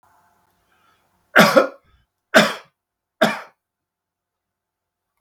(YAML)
three_cough_length: 5.2 s
three_cough_amplitude: 32768
three_cough_signal_mean_std_ratio: 0.26
survey_phase: beta (2021-08-13 to 2022-03-07)
age: 65+
gender: Male
wearing_mask: 'No'
symptom_none: true
smoker_status: Ex-smoker
respiratory_condition_asthma: false
respiratory_condition_other: false
recruitment_source: REACT
submission_delay: 3 days
covid_test_result: Negative
covid_test_method: RT-qPCR